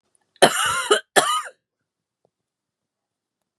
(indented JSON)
{
  "cough_length": "3.6 s",
  "cough_amplitude": 32767,
  "cough_signal_mean_std_ratio": 0.33,
  "survey_phase": "beta (2021-08-13 to 2022-03-07)",
  "age": "45-64",
  "gender": "Female",
  "wearing_mask": "No",
  "symptom_new_continuous_cough": true,
  "symptom_runny_or_blocked_nose": true,
  "symptom_sore_throat": true,
  "symptom_fatigue": true,
  "symptom_headache": true,
  "symptom_change_to_sense_of_smell_or_taste": true,
  "smoker_status": "Never smoked",
  "respiratory_condition_asthma": false,
  "respiratory_condition_other": false,
  "recruitment_source": "Test and Trace",
  "submission_delay": "1 day",
  "covid_test_result": "Positive",
  "covid_test_method": "RT-qPCR"
}